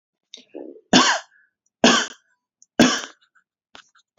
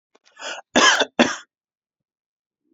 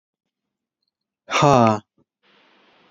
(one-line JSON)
{"three_cough_length": "4.2 s", "three_cough_amplitude": 31327, "three_cough_signal_mean_std_ratio": 0.32, "cough_length": "2.7 s", "cough_amplitude": 28103, "cough_signal_mean_std_ratio": 0.32, "exhalation_length": "2.9 s", "exhalation_amplitude": 27883, "exhalation_signal_mean_std_ratio": 0.29, "survey_phase": "beta (2021-08-13 to 2022-03-07)", "age": "18-44", "gender": "Male", "wearing_mask": "No", "symptom_cough_any": true, "symptom_runny_or_blocked_nose": true, "smoker_status": "Ex-smoker", "respiratory_condition_asthma": false, "respiratory_condition_other": false, "recruitment_source": "REACT", "submission_delay": "1 day", "covid_test_result": "Negative", "covid_test_method": "RT-qPCR", "influenza_a_test_result": "Negative", "influenza_b_test_result": "Negative"}